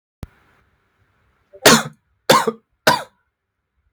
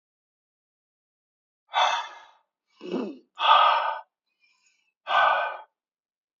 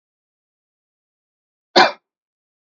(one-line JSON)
{"three_cough_length": "3.9 s", "three_cough_amplitude": 32768, "three_cough_signal_mean_std_ratio": 0.28, "exhalation_length": "6.4 s", "exhalation_amplitude": 18964, "exhalation_signal_mean_std_ratio": 0.38, "cough_length": "2.7 s", "cough_amplitude": 32768, "cough_signal_mean_std_ratio": 0.17, "survey_phase": "beta (2021-08-13 to 2022-03-07)", "age": "18-44", "gender": "Male", "wearing_mask": "No", "symptom_none": true, "smoker_status": "Never smoked", "respiratory_condition_asthma": false, "respiratory_condition_other": false, "recruitment_source": "REACT", "submission_delay": "2 days", "covid_test_result": "Negative", "covid_test_method": "RT-qPCR", "influenza_a_test_result": "Negative", "influenza_b_test_result": "Negative"}